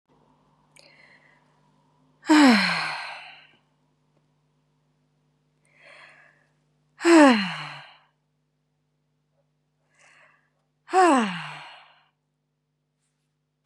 {"exhalation_length": "13.7 s", "exhalation_amplitude": 23509, "exhalation_signal_mean_std_ratio": 0.27, "survey_phase": "beta (2021-08-13 to 2022-03-07)", "age": "18-44", "gender": "Female", "wearing_mask": "No", "symptom_none": true, "smoker_status": "Current smoker (1 to 10 cigarettes per day)", "respiratory_condition_asthma": false, "respiratory_condition_other": false, "recruitment_source": "REACT", "submission_delay": "3 days", "covid_test_result": "Negative", "covid_test_method": "RT-qPCR", "influenza_a_test_result": "Negative", "influenza_b_test_result": "Negative"}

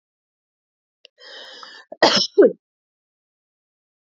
{"cough_length": "4.2 s", "cough_amplitude": 28797, "cough_signal_mean_std_ratio": 0.24, "survey_phase": "beta (2021-08-13 to 2022-03-07)", "age": "45-64", "gender": "Female", "wearing_mask": "No", "symptom_none": true, "smoker_status": "Never smoked", "respiratory_condition_asthma": false, "respiratory_condition_other": false, "recruitment_source": "Test and Trace", "submission_delay": "0 days", "covid_test_result": "Negative", "covid_test_method": "LFT"}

